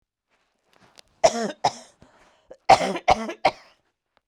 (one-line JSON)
{"cough_length": "4.3 s", "cough_amplitude": 25216, "cough_signal_mean_std_ratio": 0.29, "survey_phase": "beta (2021-08-13 to 2022-03-07)", "age": "45-64", "gender": "Female", "wearing_mask": "No", "symptom_none": true, "smoker_status": "Never smoked", "respiratory_condition_asthma": false, "respiratory_condition_other": false, "recruitment_source": "REACT", "submission_delay": "2 days", "covid_test_result": "Negative", "covid_test_method": "RT-qPCR", "influenza_a_test_result": "Negative", "influenza_b_test_result": "Negative"}